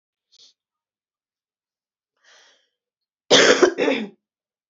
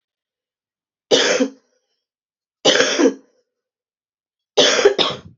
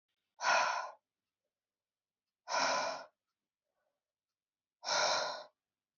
{
  "cough_length": "4.7 s",
  "cough_amplitude": 29810,
  "cough_signal_mean_std_ratio": 0.28,
  "three_cough_length": "5.4 s",
  "three_cough_amplitude": 30578,
  "three_cough_signal_mean_std_ratio": 0.4,
  "exhalation_length": "6.0 s",
  "exhalation_amplitude": 3590,
  "exhalation_signal_mean_std_ratio": 0.41,
  "survey_phase": "beta (2021-08-13 to 2022-03-07)",
  "age": "45-64",
  "gender": "Female",
  "wearing_mask": "No",
  "symptom_cough_any": true,
  "symptom_runny_or_blocked_nose": true,
  "symptom_fatigue": true,
  "symptom_onset": "10 days",
  "smoker_status": "Current smoker (1 to 10 cigarettes per day)",
  "respiratory_condition_asthma": true,
  "respiratory_condition_other": false,
  "recruitment_source": "Test and Trace",
  "submission_delay": "1 day",
  "covid_test_result": "Negative",
  "covid_test_method": "RT-qPCR"
}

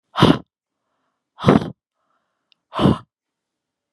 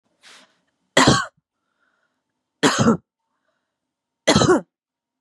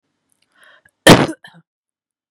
{
  "exhalation_length": "3.9 s",
  "exhalation_amplitude": 32768,
  "exhalation_signal_mean_std_ratio": 0.29,
  "three_cough_length": "5.2 s",
  "three_cough_amplitude": 32704,
  "three_cough_signal_mean_std_ratio": 0.33,
  "cough_length": "2.3 s",
  "cough_amplitude": 32768,
  "cough_signal_mean_std_ratio": 0.23,
  "survey_phase": "beta (2021-08-13 to 2022-03-07)",
  "age": "18-44",
  "gender": "Female",
  "wearing_mask": "No",
  "symptom_none": true,
  "smoker_status": "Current smoker (1 to 10 cigarettes per day)",
  "respiratory_condition_asthma": false,
  "respiratory_condition_other": false,
  "recruitment_source": "REACT",
  "submission_delay": "1 day",
  "covid_test_result": "Negative",
  "covid_test_method": "RT-qPCR",
  "influenza_a_test_result": "Negative",
  "influenza_b_test_result": "Negative"
}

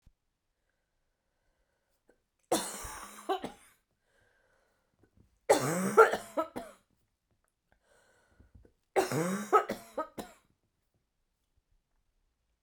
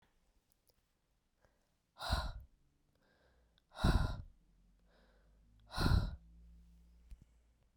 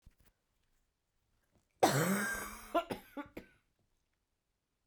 {
  "three_cough_length": "12.6 s",
  "three_cough_amplitude": 14975,
  "three_cough_signal_mean_std_ratio": 0.27,
  "exhalation_length": "7.8 s",
  "exhalation_amplitude": 3682,
  "exhalation_signal_mean_std_ratio": 0.3,
  "cough_length": "4.9 s",
  "cough_amplitude": 7030,
  "cough_signal_mean_std_ratio": 0.33,
  "survey_phase": "beta (2021-08-13 to 2022-03-07)",
  "age": "45-64",
  "gender": "Female",
  "wearing_mask": "No",
  "symptom_cough_any": true,
  "symptom_runny_or_blocked_nose": true,
  "symptom_fatigue": true,
  "symptom_fever_high_temperature": true,
  "symptom_headache": true,
  "symptom_change_to_sense_of_smell_or_taste": true,
  "symptom_loss_of_taste": true,
  "symptom_onset": "4 days",
  "smoker_status": "Never smoked",
  "respiratory_condition_asthma": false,
  "respiratory_condition_other": false,
  "recruitment_source": "Test and Trace",
  "submission_delay": "2 days",
  "covid_test_result": "Positive",
  "covid_test_method": "RT-qPCR"
}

